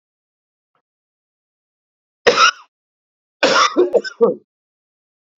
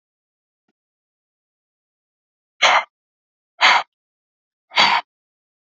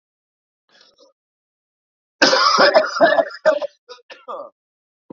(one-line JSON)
{"cough_length": "5.4 s", "cough_amplitude": 29718, "cough_signal_mean_std_ratio": 0.32, "exhalation_length": "5.6 s", "exhalation_amplitude": 31154, "exhalation_signal_mean_std_ratio": 0.27, "three_cough_length": "5.1 s", "three_cough_amplitude": 28791, "three_cough_signal_mean_std_ratio": 0.4, "survey_phase": "beta (2021-08-13 to 2022-03-07)", "age": "18-44", "gender": "Male", "wearing_mask": "No", "symptom_cough_any": true, "symptom_new_continuous_cough": true, "symptom_runny_or_blocked_nose": true, "symptom_shortness_of_breath": true, "symptom_sore_throat": true, "symptom_fatigue": true, "symptom_onset": "2 days", "smoker_status": "Current smoker (e-cigarettes or vapes only)", "respiratory_condition_asthma": true, "respiratory_condition_other": true, "recruitment_source": "Test and Trace", "submission_delay": "1 day", "covid_test_result": "Positive", "covid_test_method": "RT-qPCR", "covid_ct_value": 15.1, "covid_ct_gene": "ORF1ab gene"}